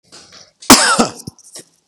{"cough_length": "1.9 s", "cough_amplitude": 32768, "cough_signal_mean_std_ratio": 0.36, "survey_phase": "beta (2021-08-13 to 2022-03-07)", "age": "45-64", "gender": "Male", "wearing_mask": "No", "symptom_none": true, "smoker_status": "Current smoker (1 to 10 cigarettes per day)", "respiratory_condition_asthma": false, "respiratory_condition_other": false, "recruitment_source": "REACT", "submission_delay": "1 day", "covid_test_result": "Negative", "covid_test_method": "RT-qPCR", "influenza_a_test_result": "Negative", "influenza_b_test_result": "Negative"}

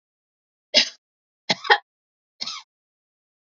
{"three_cough_length": "3.5 s", "three_cough_amplitude": 30545, "three_cough_signal_mean_std_ratio": 0.22, "survey_phase": "beta (2021-08-13 to 2022-03-07)", "age": "45-64", "gender": "Female", "wearing_mask": "No", "symptom_none": true, "smoker_status": "Never smoked", "respiratory_condition_asthma": false, "respiratory_condition_other": false, "recruitment_source": "REACT", "submission_delay": "2 days", "covid_test_result": "Negative", "covid_test_method": "RT-qPCR", "influenza_a_test_result": "Negative", "influenza_b_test_result": "Negative"}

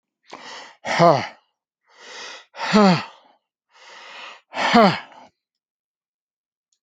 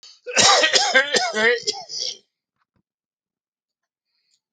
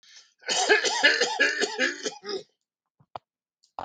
{"exhalation_length": "6.8 s", "exhalation_amplitude": 29167, "exhalation_signal_mean_std_ratio": 0.33, "cough_length": "4.5 s", "cough_amplitude": 31776, "cough_signal_mean_std_ratio": 0.44, "three_cough_length": "3.8 s", "three_cough_amplitude": 16459, "three_cough_signal_mean_std_ratio": 0.51, "survey_phase": "alpha (2021-03-01 to 2021-08-12)", "age": "65+", "gender": "Male", "wearing_mask": "Yes", "symptom_none": true, "smoker_status": "Never smoked", "respiratory_condition_asthma": false, "respiratory_condition_other": false, "recruitment_source": "REACT", "submission_delay": "3 days", "covid_test_result": "Negative", "covid_test_method": "RT-qPCR"}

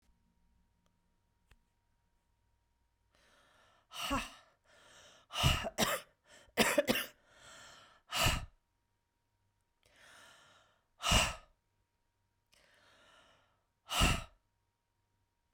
{"exhalation_length": "15.5 s", "exhalation_amplitude": 6647, "exhalation_signal_mean_std_ratio": 0.3, "survey_phase": "beta (2021-08-13 to 2022-03-07)", "age": "45-64", "gender": "Female", "wearing_mask": "No", "symptom_runny_or_blocked_nose": true, "symptom_onset": "4 days", "smoker_status": "Never smoked", "respiratory_condition_asthma": false, "respiratory_condition_other": false, "recruitment_source": "REACT", "submission_delay": "2 days", "covid_test_result": "Negative", "covid_test_method": "RT-qPCR"}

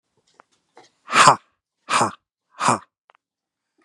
{"exhalation_length": "3.8 s", "exhalation_amplitude": 32768, "exhalation_signal_mean_std_ratio": 0.29, "survey_phase": "beta (2021-08-13 to 2022-03-07)", "age": "18-44", "gender": "Male", "wearing_mask": "No", "symptom_none": true, "smoker_status": "Current smoker (e-cigarettes or vapes only)", "respiratory_condition_asthma": false, "respiratory_condition_other": false, "recruitment_source": "REACT", "submission_delay": "8 days", "covid_test_result": "Negative", "covid_test_method": "RT-qPCR", "influenza_a_test_result": "Negative", "influenza_b_test_result": "Negative"}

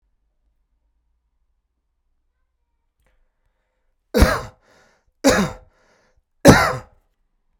{"three_cough_length": "7.6 s", "three_cough_amplitude": 32768, "three_cough_signal_mean_std_ratio": 0.23, "survey_phase": "beta (2021-08-13 to 2022-03-07)", "age": "45-64", "gender": "Male", "wearing_mask": "No", "symptom_runny_or_blocked_nose": true, "smoker_status": "Ex-smoker", "respiratory_condition_asthma": true, "respiratory_condition_other": false, "recruitment_source": "Test and Trace", "submission_delay": "2 days", "covid_test_result": "Negative", "covid_test_method": "RT-qPCR"}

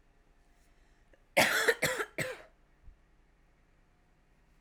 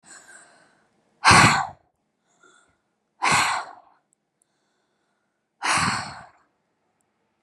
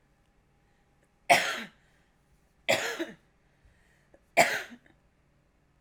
{"cough_length": "4.6 s", "cough_amplitude": 8760, "cough_signal_mean_std_ratio": 0.32, "exhalation_length": "7.4 s", "exhalation_amplitude": 29168, "exhalation_signal_mean_std_ratio": 0.31, "three_cough_length": "5.8 s", "three_cough_amplitude": 17386, "three_cough_signal_mean_std_ratio": 0.27, "survey_phase": "alpha (2021-03-01 to 2021-08-12)", "age": "18-44", "gender": "Female", "wearing_mask": "No", "symptom_none": true, "smoker_status": "Ex-smoker", "respiratory_condition_asthma": true, "respiratory_condition_other": false, "recruitment_source": "REACT", "submission_delay": "1 day", "covid_test_result": "Negative", "covid_test_method": "RT-qPCR"}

